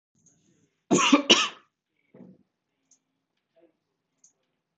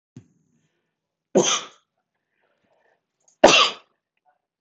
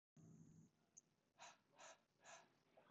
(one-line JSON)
{"cough_length": "4.8 s", "cough_amplitude": 23077, "cough_signal_mean_std_ratio": 0.24, "three_cough_length": "4.6 s", "three_cough_amplitude": 25697, "three_cough_signal_mean_std_ratio": 0.24, "exhalation_length": "2.9 s", "exhalation_amplitude": 105, "exhalation_signal_mean_std_ratio": 0.64, "survey_phase": "beta (2021-08-13 to 2022-03-07)", "age": "45-64", "gender": "Male", "wearing_mask": "No", "symptom_none": true, "smoker_status": "Ex-smoker", "respiratory_condition_asthma": false, "respiratory_condition_other": false, "recruitment_source": "REACT", "submission_delay": "1 day", "covid_test_result": "Negative", "covid_test_method": "RT-qPCR"}